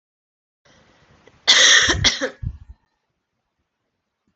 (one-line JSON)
{"cough_length": "4.4 s", "cough_amplitude": 30892, "cough_signal_mean_std_ratio": 0.33, "survey_phase": "alpha (2021-03-01 to 2021-08-12)", "age": "18-44", "gender": "Female", "wearing_mask": "No", "symptom_shortness_of_breath": true, "symptom_fatigue": true, "symptom_fever_high_temperature": true, "symptom_headache": true, "smoker_status": "Never smoked", "respiratory_condition_asthma": false, "respiratory_condition_other": false, "recruitment_source": "Test and Trace", "submission_delay": "2 days", "covid_test_result": "Positive", "covid_test_method": "RT-qPCR", "covid_ct_value": 25.4, "covid_ct_gene": "ORF1ab gene", "covid_ct_mean": 26.3, "covid_viral_load": "2400 copies/ml", "covid_viral_load_category": "Minimal viral load (< 10K copies/ml)"}